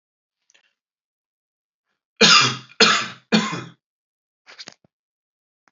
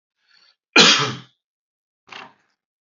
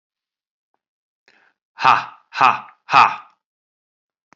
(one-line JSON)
{"three_cough_length": "5.7 s", "three_cough_amplitude": 31506, "three_cough_signal_mean_std_ratio": 0.29, "cough_length": "2.9 s", "cough_amplitude": 31683, "cough_signal_mean_std_ratio": 0.27, "exhalation_length": "4.4 s", "exhalation_amplitude": 28355, "exhalation_signal_mean_std_ratio": 0.27, "survey_phase": "alpha (2021-03-01 to 2021-08-12)", "age": "45-64", "gender": "Male", "wearing_mask": "No", "symptom_none": true, "smoker_status": "Never smoked", "respiratory_condition_asthma": true, "respiratory_condition_other": false, "recruitment_source": "REACT", "submission_delay": "2 days", "covid_test_result": "Negative", "covid_test_method": "RT-qPCR"}